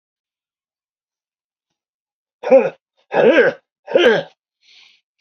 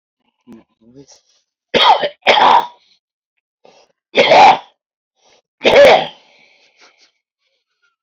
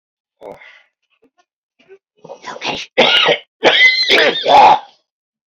{"exhalation_length": "5.2 s", "exhalation_amplitude": 31824, "exhalation_signal_mean_std_ratio": 0.34, "three_cough_length": "8.0 s", "three_cough_amplitude": 32768, "three_cough_signal_mean_std_ratio": 0.37, "cough_length": "5.5 s", "cough_amplitude": 31126, "cough_signal_mean_std_ratio": 0.47, "survey_phase": "beta (2021-08-13 to 2022-03-07)", "age": "45-64", "gender": "Male", "wearing_mask": "No", "symptom_cough_any": true, "smoker_status": "Ex-smoker", "respiratory_condition_asthma": true, "respiratory_condition_other": true, "recruitment_source": "REACT", "submission_delay": "1 day", "covid_test_result": "Negative", "covid_test_method": "RT-qPCR", "influenza_a_test_result": "Unknown/Void", "influenza_b_test_result": "Unknown/Void"}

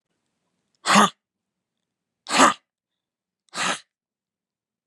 {"exhalation_length": "4.9 s", "exhalation_amplitude": 29807, "exhalation_signal_mean_std_ratio": 0.26, "survey_phase": "beta (2021-08-13 to 2022-03-07)", "age": "45-64", "gender": "Female", "wearing_mask": "Yes", "symptom_runny_or_blocked_nose": true, "symptom_sore_throat": true, "symptom_fatigue": true, "symptom_onset": "7 days", "smoker_status": "Never smoked", "respiratory_condition_asthma": false, "respiratory_condition_other": false, "recruitment_source": "Test and Trace", "submission_delay": "3 days", "covid_test_result": "Negative", "covid_test_method": "RT-qPCR"}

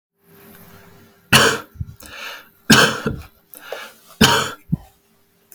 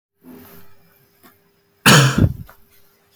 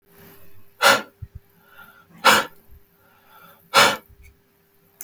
{"three_cough_length": "5.5 s", "three_cough_amplitude": 32768, "three_cough_signal_mean_std_ratio": 0.36, "cough_length": "3.2 s", "cough_amplitude": 32768, "cough_signal_mean_std_ratio": 0.32, "exhalation_length": "5.0 s", "exhalation_amplitude": 32766, "exhalation_signal_mean_std_ratio": 0.3, "survey_phase": "beta (2021-08-13 to 2022-03-07)", "age": "18-44", "gender": "Male", "wearing_mask": "No", "symptom_none": true, "smoker_status": "Never smoked", "respiratory_condition_asthma": false, "respiratory_condition_other": false, "recruitment_source": "REACT", "submission_delay": "2 days", "covid_test_result": "Negative", "covid_test_method": "RT-qPCR", "influenza_a_test_result": "Negative", "influenza_b_test_result": "Negative"}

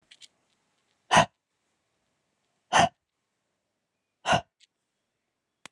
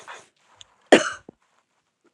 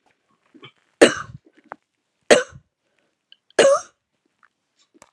{"exhalation_length": "5.7 s", "exhalation_amplitude": 15900, "exhalation_signal_mean_std_ratio": 0.21, "cough_length": "2.1 s", "cough_amplitude": 32640, "cough_signal_mean_std_ratio": 0.19, "three_cough_length": "5.1 s", "three_cough_amplitude": 32768, "three_cough_signal_mean_std_ratio": 0.23, "survey_phase": "alpha (2021-03-01 to 2021-08-12)", "age": "45-64", "gender": "Female", "wearing_mask": "No", "symptom_cough_any": true, "symptom_fatigue": true, "symptom_headache": true, "smoker_status": "Never smoked", "respiratory_condition_asthma": false, "respiratory_condition_other": false, "recruitment_source": "Test and Trace", "submission_delay": "2 days", "covid_test_result": "Positive", "covid_test_method": "RT-qPCR", "covid_ct_value": 18.5, "covid_ct_gene": "ORF1ab gene", "covid_ct_mean": 20.1, "covid_viral_load": "260000 copies/ml", "covid_viral_load_category": "Low viral load (10K-1M copies/ml)"}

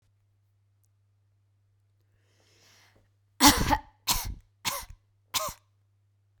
{"cough_length": "6.4 s", "cough_amplitude": 30546, "cough_signal_mean_std_ratio": 0.25, "survey_phase": "beta (2021-08-13 to 2022-03-07)", "age": "45-64", "gender": "Female", "wearing_mask": "No", "symptom_none": true, "smoker_status": "Never smoked", "respiratory_condition_asthma": false, "respiratory_condition_other": false, "recruitment_source": "REACT", "submission_delay": "7 days", "covid_test_result": "Negative", "covid_test_method": "RT-qPCR"}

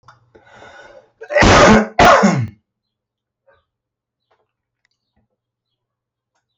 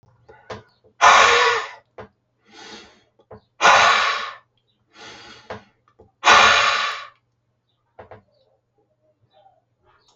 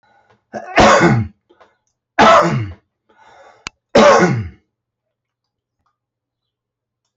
{"cough_length": "6.6 s", "cough_amplitude": 29494, "cough_signal_mean_std_ratio": 0.33, "exhalation_length": "10.2 s", "exhalation_amplitude": 28915, "exhalation_signal_mean_std_ratio": 0.36, "three_cough_length": "7.2 s", "three_cough_amplitude": 29545, "three_cough_signal_mean_std_ratio": 0.38, "survey_phase": "alpha (2021-03-01 to 2021-08-12)", "age": "45-64", "gender": "Male", "wearing_mask": "No", "symptom_fatigue": true, "symptom_onset": "8 days", "smoker_status": "Never smoked", "respiratory_condition_asthma": false, "respiratory_condition_other": false, "recruitment_source": "REACT", "submission_delay": "1 day", "covid_test_result": "Negative", "covid_test_method": "RT-qPCR"}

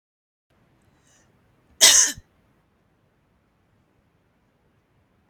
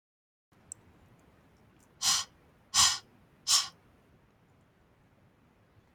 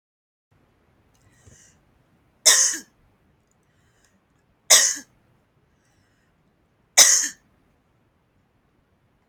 {"cough_length": "5.3 s", "cough_amplitude": 32768, "cough_signal_mean_std_ratio": 0.19, "exhalation_length": "5.9 s", "exhalation_amplitude": 11434, "exhalation_signal_mean_std_ratio": 0.27, "three_cough_length": "9.3 s", "three_cough_amplitude": 32768, "three_cough_signal_mean_std_ratio": 0.23, "survey_phase": "beta (2021-08-13 to 2022-03-07)", "age": "65+", "gender": "Female", "wearing_mask": "No", "symptom_other": true, "smoker_status": "Never smoked", "respiratory_condition_asthma": true, "respiratory_condition_other": false, "recruitment_source": "REACT", "submission_delay": "2 days", "covid_test_result": "Negative", "covid_test_method": "RT-qPCR", "influenza_a_test_result": "Negative", "influenza_b_test_result": "Negative"}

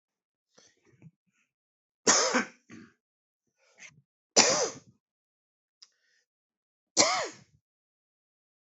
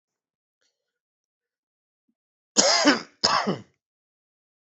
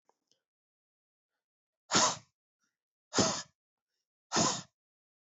{"three_cough_length": "8.6 s", "three_cough_amplitude": 17664, "three_cough_signal_mean_std_ratio": 0.26, "cough_length": "4.7 s", "cough_amplitude": 29663, "cough_signal_mean_std_ratio": 0.3, "exhalation_length": "5.2 s", "exhalation_amplitude": 8058, "exhalation_signal_mean_std_ratio": 0.29, "survey_phase": "beta (2021-08-13 to 2022-03-07)", "age": "45-64", "gender": "Male", "wearing_mask": "No", "symptom_cough_any": true, "symptom_runny_or_blocked_nose": true, "symptom_shortness_of_breath": true, "symptom_fatigue": true, "symptom_headache": true, "symptom_onset": "2 days", "smoker_status": "Never smoked", "respiratory_condition_asthma": false, "respiratory_condition_other": false, "recruitment_source": "Test and Trace", "submission_delay": "1 day", "covid_test_result": "Positive", "covid_test_method": "RT-qPCR", "covid_ct_value": 18.9, "covid_ct_gene": "ORF1ab gene", "covid_ct_mean": 19.2, "covid_viral_load": "510000 copies/ml", "covid_viral_load_category": "Low viral load (10K-1M copies/ml)"}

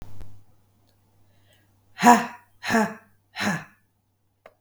{"exhalation_length": "4.6 s", "exhalation_amplitude": 32413, "exhalation_signal_mean_std_ratio": 0.31, "survey_phase": "beta (2021-08-13 to 2022-03-07)", "age": "45-64", "gender": "Female", "wearing_mask": "No", "symptom_cough_any": true, "symptom_runny_or_blocked_nose": true, "symptom_sore_throat": true, "symptom_fatigue": true, "symptom_fever_high_temperature": true, "symptom_headache": true, "symptom_change_to_sense_of_smell_or_taste": true, "symptom_loss_of_taste": true, "smoker_status": "Never smoked", "respiratory_condition_asthma": false, "respiratory_condition_other": false, "recruitment_source": "Test and Trace", "submission_delay": "2 days", "covid_test_result": "Positive", "covid_test_method": "RT-qPCR", "covid_ct_value": 18.3, "covid_ct_gene": "ORF1ab gene", "covid_ct_mean": 18.6, "covid_viral_load": "780000 copies/ml", "covid_viral_load_category": "Low viral load (10K-1M copies/ml)"}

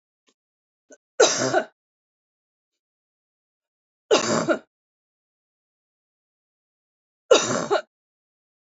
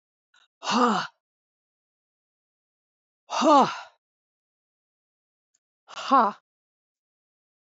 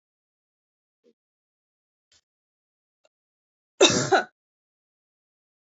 {"three_cough_length": "8.7 s", "three_cough_amplitude": 26499, "three_cough_signal_mean_std_ratio": 0.27, "exhalation_length": "7.7 s", "exhalation_amplitude": 17186, "exhalation_signal_mean_std_ratio": 0.28, "cough_length": "5.7 s", "cough_amplitude": 20916, "cough_signal_mean_std_ratio": 0.19, "survey_phase": "beta (2021-08-13 to 2022-03-07)", "age": "45-64", "gender": "Female", "wearing_mask": "No", "symptom_none": true, "smoker_status": "Never smoked", "respiratory_condition_asthma": false, "respiratory_condition_other": false, "recruitment_source": "REACT", "submission_delay": "0 days", "covid_test_result": "Negative", "covid_test_method": "RT-qPCR", "influenza_a_test_result": "Negative", "influenza_b_test_result": "Negative"}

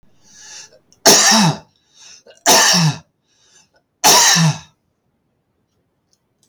{"three_cough_length": "6.5 s", "three_cough_amplitude": 32768, "three_cough_signal_mean_std_ratio": 0.43, "survey_phase": "beta (2021-08-13 to 2022-03-07)", "age": "65+", "gender": "Male", "wearing_mask": "No", "symptom_none": true, "smoker_status": "Ex-smoker", "respiratory_condition_asthma": false, "respiratory_condition_other": false, "recruitment_source": "REACT", "submission_delay": "1 day", "covid_test_result": "Negative", "covid_test_method": "RT-qPCR", "influenza_a_test_result": "Negative", "influenza_b_test_result": "Negative"}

